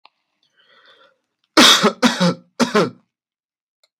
{
  "three_cough_length": "4.0 s",
  "three_cough_amplitude": 32768,
  "three_cough_signal_mean_std_ratio": 0.35,
  "survey_phase": "beta (2021-08-13 to 2022-03-07)",
  "age": "18-44",
  "gender": "Male",
  "wearing_mask": "No",
  "symptom_none": true,
  "smoker_status": "Ex-smoker",
  "respiratory_condition_asthma": false,
  "respiratory_condition_other": false,
  "recruitment_source": "REACT",
  "submission_delay": "3 days",
  "covid_test_result": "Negative",
  "covid_test_method": "RT-qPCR",
  "influenza_a_test_result": "Negative",
  "influenza_b_test_result": "Negative"
}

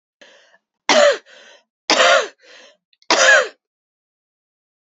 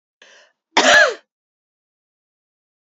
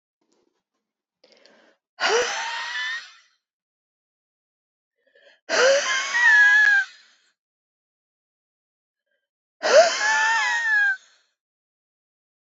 {
  "three_cough_length": "4.9 s",
  "three_cough_amplitude": 32768,
  "three_cough_signal_mean_std_ratio": 0.37,
  "cough_length": "2.8 s",
  "cough_amplitude": 29025,
  "cough_signal_mean_std_ratio": 0.29,
  "exhalation_length": "12.5 s",
  "exhalation_amplitude": 23418,
  "exhalation_signal_mean_std_ratio": 0.43,
  "survey_phase": "beta (2021-08-13 to 2022-03-07)",
  "age": "18-44",
  "gender": "Female",
  "wearing_mask": "No",
  "symptom_cough_any": true,
  "symptom_new_continuous_cough": true,
  "symptom_fatigue": true,
  "symptom_onset": "3 days",
  "smoker_status": "Never smoked",
  "respiratory_condition_asthma": false,
  "respiratory_condition_other": false,
  "recruitment_source": "Test and Trace",
  "submission_delay": "2 days",
  "covid_test_result": "Positive",
  "covid_test_method": "RT-qPCR",
  "covid_ct_value": 26.6,
  "covid_ct_gene": "ORF1ab gene"
}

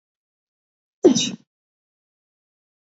{
  "cough_length": "2.9 s",
  "cough_amplitude": 24704,
  "cough_signal_mean_std_ratio": 0.2,
  "survey_phase": "alpha (2021-03-01 to 2021-08-12)",
  "age": "18-44",
  "gender": "Female",
  "wearing_mask": "No",
  "symptom_cough_any": true,
  "symptom_new_continuous_cough": true,
  "symptom_abdominal_pain": true,
  "symptom_diarrhoea": true,
  "symptom_fatigue": true,
  "symptom_fever_high_temperature": true,
  "symptom_headache": true,
  "symptom_onset": "3 days",
  "smoker_status": "Never smoked",
  "respiratory_condition_asthma": false,
  "respiratory_condition_other": false,
  "recruitment_source": "Test and Trace",
  "submission_delay": "1 day",
  "covid_test_result": "Positive",
  "covid_test_method": "RT-qPCR",
  "covid_ct_value": 15.2,
  "covid_ct_gene": "ORF1ab gene",
  "covid_ct_mean": 15.5,
  "covid_viral_load": "8400000 copies/ml",
  "covid_viral_load_category": "High viral load (>1M copies/ml)"
}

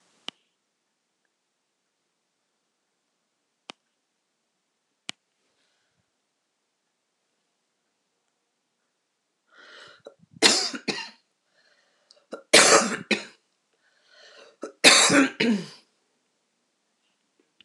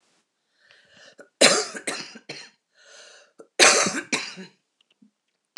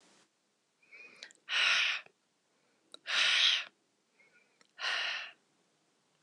{
  "three_cough_length": "17.6 s",
  "three_cough_amplitude": 26028,
  "three_cough_signal_mean_std_ratio": 0.22,
  "cough_length": "5.6 s",
  "cough_amplitude": 26028,
  "cough_signal_mean_std_ratio": 0.3,
  "exhalation_length": "6.2 s",
  "exhalation_amplitude": 6264,
  "exhalation_signal_mean_std_ratio": 0.4,
  "survey_phase": "beta (2021-08-13 to 2022-03-07)",
  "age": "45-64",
  "gender": "Female",
  "wearing_mask": "No",
  "symptom_cough_any": true,
  "symptom_runny_or_blocked_nose": true,
  "symptom_sore_throat": true,
  "symptom_fatigue": true,
  "symptom_headache": true,
  "smoker_status": "Ex-smoker",
  "respiratory_condition_asthma": false,
  "respiratory_condition_other": true,
  "recruitment_source": "Test and Trace",
  "submission_delay": "1 day",
  "covid_test_result": "Positive",
  "covid_test_method": "RT-qPCR",
  "covid_ct_value": 34.8,
  "covid_ct_gene": "ORF1ab gene"
}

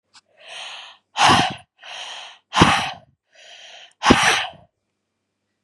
{
  "exhalation_length": "5.6 s",
  "exhalation_amplitude": 32768,
  "exhalation_signal_mean_std_ratio": 0.38,
  "survey_phase": "beta (2021-08-13 to 2022-03-07)",
  "age": "18-44",
  "gender": "Female",
  "wearing_mask": "No",
  "symptom_cough_any": true,
  "symptom_new_continuous_cough": true,
  "symptom_runny_or_blocked_nose": true,
  "symptom_shortness_of_breath": true,
  "symptom_sore_throat": true,
  "symptom_fatigue": true,
  "symptom_fever_high_temperature": true,
  "symptom_headache": true,
  "symptom_change_to_sense_of_smell_or_taste": true,
  "symptom_onset": "4 days",
  "smoker_status": "Ex-smoker",
  "respiratory_condition_asthma": false,
  "respiratory_condition_other": false,
  "recruitment_source": "Test and Trace",
  "submission_delay": "1 day",
  "covid_test_result": "Positive",
  "covid_test_method": "RT-qPCR",
  "covid_ct_value": 19.4,
  "covid_ct_gene": "N gene"
}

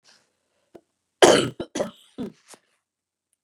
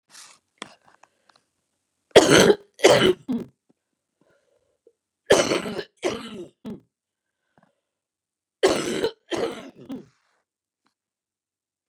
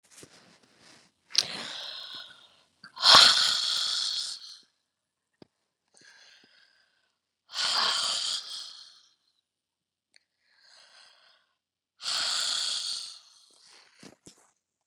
{
  "cough_length": "3.4 s",
  "cough_amplitude": 31761,
  "cough_signal_mean_std_ratio": 0.24,
  "three_cough_length": "11.9 s",
  "three_cough_amplitude": 32735,
  "three_cough_signal_mean_std_ratio": 0.29,
  "exhalation_length": "14.9 s",
  "exhalation_amplitude": 31506,
  "exhalation_signal_mean_std_ratio": 0.32,
  "survey_phase": "beta (2021-08-13 to 2022-03-07)",
  "age": "45-64",
  "gender": "Female",
  "wearing_mask": "No",
  "symptom_none": true,
  "smoker_status": "Never smoked",
  "respiratory_condition_asthma": false,
  "respiratory_condition_other": false,
  "recruitment_source": "REACT",
  "submission_delay": "2 days",
  "covid_test_result": "Negative",
  "covid_test_method": "RT-qPCR"
}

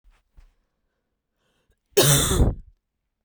{
  "cough_length": "3.2 s",
  "cough_amplitude": 23847,
  "cough_signal_mean_std_ratio": 0.35,
  "survey_phase": "beta (2021-08-13 to 2022-03-07)",
  "age": "18-44",
  "gender": "Female",
  "wearing_mask": "Yes",
  "symptom_cough_any": true,
  "symptom_runny_or_blocked_nose": true,
  "symptom_sore_throat": true,
  "symptom_fatigue": true,
  "symptom_headache": true,
  "symptom_change_to_sense_of_smell_or_taste": true,
  "symptom_loss_of_taste": true,
  "symptom_onset": "6 days",
  "smoker_status": "Never smoked",
  "respiratory_condition_asthma": false,
  "respiratory_condition_other": false,
  "recruitment_source": "Test and Trace",
  "submission_delay": "1 day",
  "covid_test_result": "Positive",
  "covid_test_method": "RT-qPCR"
}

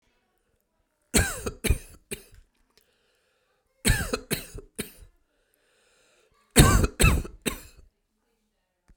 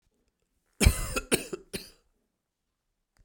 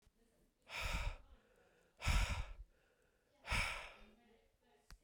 {
  "three_cough_length": "9.0 s",
  "three_cough_amplitude": 28582,
  "three_cough_signal_mean_std_ratio": 0.3,
  "cough_length": "3.2 s",
  "cough_amplitude": 18370,
  "cough_signal_mean_std_ratio": 0.26,
  "exhalation_length": "5.0 s",
  "exhalation_amplitude": 1877,
  "exhalation_signal_mean_std_ratio": 0.43,
  "survey_phase": "beta (2021-08-13 to 2022-03-07)",
  "age": "45-64",
  "gender": "Male",
  "wearing_mask": "No",
  "symptom_none": true,
  "smoker_status": "Ex-smoker",
  "respiratory_condition_asthma": false,
  "respiratory_condition_other": false,
  "recruitment_source": "REACT",
  "submission_delay": "1 day",
  "covid_test_result": "Negative",
  "covid_test_method": "RT-qPCR"
}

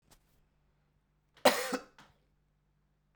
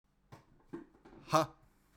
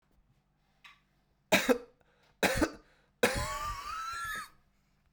{
  "cough_length": "3.2 s",
  "cough_amplitude": 10882,
  "cough_signal_mean_std_ratio": 0.21,
  "exhalation_length": "2.0 s",
  "exhalation_amplitude": 6193,
  "exhalation_signal_mean_std_ratio": 0.26,
  "three_cough_length": "5.1 s",
  "three_cough_amplitude": 9587,
  "three_cough_signal_mean_std_ratio": 0.4,
  "survey_phase": "beta (2021-08-13 to 2022-03-07)",
  "age": "18-44",
  "gender": "Male",
  "wearing_mask": "No",
  "symptom_cough_any": true,
  "symptom_runny_or_blocked_nose": true,
  "symptom_sore_throat": true,
  "symptom_fatigue": true,
  "symptom_fever_high_temperature": true,
  "smoker_status": "Never smoked",
  "respiratory_condition_asthma": false,
  "respiratory_condition_other": false,
  "recruitment_source": "Test and Trace",
  "submission_delay": "2 days",
  "covid_test_result": "Positive",
  "covid_test_method": "RT-qPCR",
  "covid_ct_value": 35.5,
  "covid_ct_gene": "N gene"
}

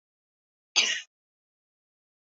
{
  "cough_length": "2.3 s",
  "cough_amplitude": 17459,
  "cough_signal_mean_std_ratio": 0.23,
  "survey_phase": "beta (2021-08-13 to 2022-03-07)",
  "age": "45-64",
  "gender": "Female",
  "wearing_mask": "No",
  "symptom_none": true,
  "smoker_status": "Ex-smoker",
  "respiratory_condition_asthma": false,
  "respiratory_condition_other": false,
  "recruitment_source": "REACT",
  "submission_delay": "3 days",
  "covid_test_result": "Negative",
  "covid_test_method": "RT-qPCR",
  "influenza_a_test_result": "Negative",
  "influenza_b_test_result": "Negative"
}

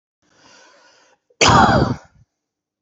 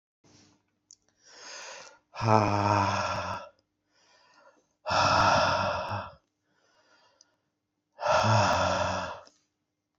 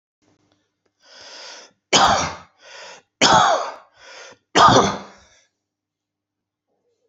{
  "cough_length": "2.8 s",
  "cough_amplitude": 31535,
  "cough_signal_mean_std_ratio": 0.36,
  "exhalation_length": "10.0 s",
  "exhalation_amplitude": 18496,
  "exhalation_signal_mean_std_ratio": 0.49,
  "three_cough_length": "7.1 s",
  "three_cough_amplitude": 31086,
  "three_cough_signal_mean_std_ratio": 0.35,
  "survey_phase": "beta (2021-08-13 to 2022-03-07)",
  "age": "45-64",
  "gender": "Male",
  "wearing_mask": "No",
  "symptom_cough_any": true,
  "symptom_runny_or_blocked_nose": true,
  "symptom_diarrhoea": true,
  "symptom_fever_high_temperature": true,
  "smoker_status": "Never smoked",
  "respiratory_condition_asthma": false,
  "respiratory_condition_other": false,
  "recruitment_source": "Test and Trace",
  "submission_delay": "2 days",
  "covid_test_result": "Positive",
  "covid_test_method": "LFT"
}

